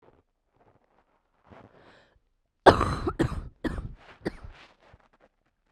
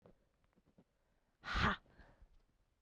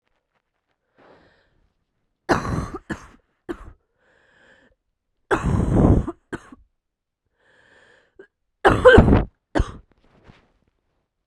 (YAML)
cough_length: 5.7 s
cough_amplitude: 32767
cough_signal_mean_std_ratio: 0.24
exhalation_length: 2.8 s
exhalation_amplitude: 2853
exhalation_signal_mean_std_ratio: 0.28
three_cough_length: 11.3 s
three_cough_amplitude: 32768
three_cough_signal_mean_std_ratio: 0.29
survey_phase: beta (2021-08-13 to 2022-03-07)
age: 18-44
gender: Male
wearing_mask: 'No'
symptom_cough_any: true
symptom_new_continuous_cough: true
symptom_runny_or_blocked_nose: true
symptom_shortness_of_breath: true
symptom_sore_throat: true
symptom_diarrhoea: true
symptom_fatigue: true
symptom_fever_high_temperature: true
symptom_headache: true
smoker_status: Never smoked
respiratory_condition_asthma: false
respiratory_condition_other: false
recruitment_source: Test and Trace
submission_delay: 5 days
covid_test_result: Negative
covid_test_method: RT-qPCR